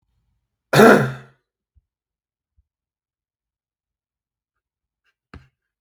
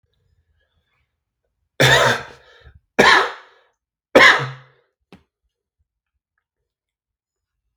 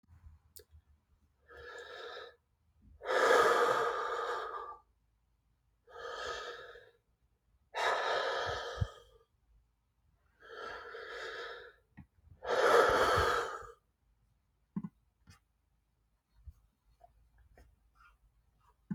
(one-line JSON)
{"cough_length": "5.8 s", "cough_amplitude": 32768, "cough_signal_mean_std_ratio": 0.19, "three_cough_length": "7.8 s", "three_cough_amplitude": 32768, "three_cough_signal_mean_std_ratio": 0.28, "exhalation_length": "18.9 s", "exhalation_amplitude": 7981, "exhalation_signal_mean_std_ratio": 0.4, "survey_phase": "beta (2021-08-13 to 2022-03-07)", "age": "45-64", "gender": "Male", "wearing_mask": "No", "symptom_cough_any": true, "symptom_headache": true, "smoker_status": "Current smoker (e-cigarettes or vapes only)", "respiratory_condition_asthma": false, "respiratory_condition_other": false, "recruitment_source": "REACT", "submission_delay": "3 days", "covid_test_result": "Negative", "covid_test_method": "RT-qPCR"}